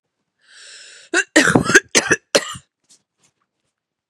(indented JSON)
{
  "cough_length": "4.1 s",
  "cough_amplitude": 32768,
  "cough_signal_mean_std_ratio": 0.33,
  "survey_phase": "beta (2021-08-13 to 2022-03-07)",
  "age": "18-44",
  "gender": "Female",
  "wearing_mask": "No",
  "symptom_cough_any": true,
  "symptom_runny_or_blocked_nose": true,
  "symptom_sore_throat": true,
  "symptom_fatigue": true,
  "symptom_fever_high_temperature": true,
  "symptom_headache": true,
  "symptom_change_to_sense_of_smell_or_taste": true,
  "smoker_status": "Ex-smoker",
  "respiratory_condition_asthma": false,
  "respiratory_condition_other": false,
  "recruitment_source": "Test and Trace",
  "submission_delay": "2 days",
  "covid_test_result": "Positive",
  "covid_test_method": "RT-qPCR",
  "covid_ct_value": 23.3,
  "covid_ct_gene": "ORF1ab gene"
}